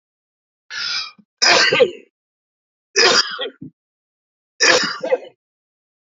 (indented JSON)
{
  "three_cough_length": "6.1 s",
  "three_cough_amplitude": 32768,
  "three_cough_signal_mean_std_ratio": 0.41,
  "survey_phase": "beta (2021-08-13 to 2022-03-07)",
  "age": "45-64",
  "gender": "Male",
  "wearing_mask": "No",
  "symptom_cough_any": true,
  "symptom_runny_or_blocked_nose": true,
  "symptom_shortness_of_breath": true,
  "symptom_sore_throat": true,
  "symptom_abdominal_pain": true,
  "symptom_diarrhoea": true,
  "symptom_fatigue": true,
  "symptom_headache": true,
  "symptom_change_to_sense_of_smell_or_taste": true,
  "smoker_status": "Never smoked",
  "respiratory_condition_asthma": false,
  "respiratory_condition_other": false,
  "recruitment_source": "Test and Trace",
  "submission_delay": "2 days",
  "covid_test_result": "Positive",
  "covid_test_method": "RT-qPCR"
}